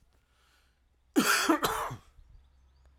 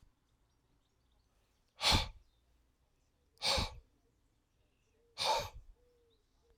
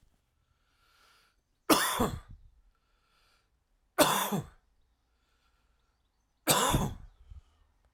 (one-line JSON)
{"cough_length": "3.0 s", "cough_amplitude": 8327, "cough_signal_mean_std_ratio": 0.4, "exhalation_length": "6.6 s", "exhalation_amplitude": 4685, "exhalation_signal_mean_std_ratio": 0.29, "three_cough_length": "7.9 s", "three_cough_amplitude": 14888, "three_cough_signal_mean_std_ratio": 0.32, "survey_phase": "alpha (2021-03-01 to 2021-08-12)", "age": "45-64", "gender": "Male", "wearing_mask": "No", "symptom_cough_any": true, "symptom_fatigue": true, "symptom_headache": true, "symptom_change_to_sense_of_smell_or_taste": true, "symptom_loss_of_taste": true, "symptom_onset": "5 days", "smoker_status": "Never smoked", "respiratory_condition_asthma": false, "respiratory_condition_other": false, "recruitment_source": "Test and Trace", "submission_delay": "3 days", "covid_test_result": "Positive", "covid_test_method": "RT-qPCR", "covid_ct_value": 18.0, "covid_ct_gene": "ORF1ab gene"}